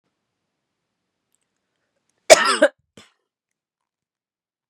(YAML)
cough_length: 4.7 s
cough_amplitude: 32768
cough_signal_mean_std_ratio: 0.17
survey_phase: beta (2021-08-13 to 2022-03-07)
age: 45-64
gender: Female
wearing_mask: 'No'
symptom_cough_any: true
symptom_onset: 4 days
smoker_status: Never smoked
respiratory_condition_asthma: false
respiratory_condition_other: false
recruitment_source: Test and Trace
submission_delay: 1 day
covid_test_result: Positive
covid_test_method: ePCR